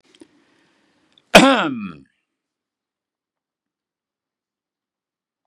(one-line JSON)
{"cough_length": "5.5 s", "cough_amplitude": 32768, "cough_signal_mean_std_ratio": 0.19, "survey_phase": "beta (2021-08-13 to 2022-03-07)", "age": "65+", "gender": "Male", "wearing_mask": "No", "symptom_none": true, "smoker_status": "Never smoked", "respiratory_condition_asthma": false, "respiratory_condition_other": false, "recruitment_source": "REACT", "submission_delay": "2 days", "covid_test_result": "Negative", "covid_test_method": "RT-qPCR", "influenza_a_test_result": "Negative", "influenza_b_test_result": "Negative"}